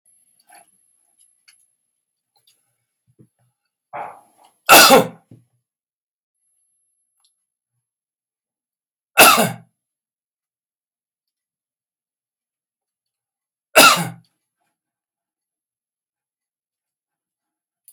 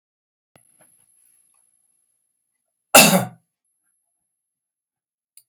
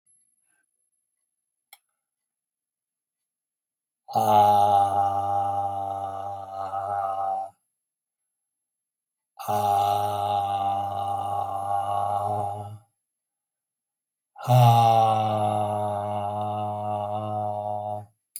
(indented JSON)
{
  "three_cough_length": "17.9 s",
  "three_cough_amplitude": 32768,
  "three_cough_signal_mean_std_ratio": 0.19,
  "cough_length": "5.5 s",
  "cough_amplitude": 32768,
  "cough_signal_mean_std_ratio": 0.18,
  "exhalation_length": "18.4 s",
  "exhalation_amplitude": 15797,
  "exhalation_signal_mean_std_ratio": 0.61,
  "survey_phase": "beta (2021-08-13 to 2022-03-07)",
  "age": "65+",
  "gender": "Male",
  "wearing_mask": "No",
  "symptom_none": true,
  "smoker_status": "Ex-smoker",
  "respiratory_condition_asthma": false,
  "respiratory_condition_other": false,
  "recruitment_source": "REACT",
  "submission_delay": "2 days",
  "covid_test_result": "Negative",
  "covid_test_method": "RT-qPCR",
  "influenza_a_test_result": "Negative",
  "influenza_b_test_result": "Negative"
}